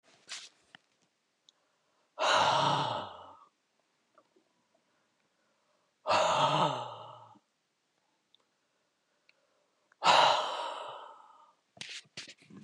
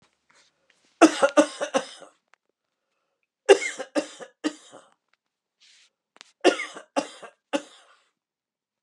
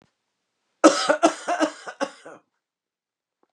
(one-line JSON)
{"exhalation_length": "12.6 s", "exhalation_amplitude": 9550, "exhalation_signal_mean_std_ratio": 0.37, "three_cough_length": "8.8 s", "three_cough_amplitude": 29032, "three_cough_signal_mean_std_ratio": 0.24, "cough_length": "3.5 s", "cough_amplitude": 31080, "cough_signal_mean_std_ratio": 0.31, "survey_phase": "beta (2021-08-13 to 2022-03-07)", "age": "45-64", "gender": "Male", "wearing_mask": "No", "symptom_none": true, "smoker_status": "Never smoked", "respiratory_condition_asthma": false, "respiratory_condition_other": false, "recruitment_source": "REACT", "submission_delay": "1 day", "covid_test_result": "Negative", "covid_test_method": "RT-qPCR", "influenza_a_test_result": "Negative", "influenza_b_test_result": "Negative"}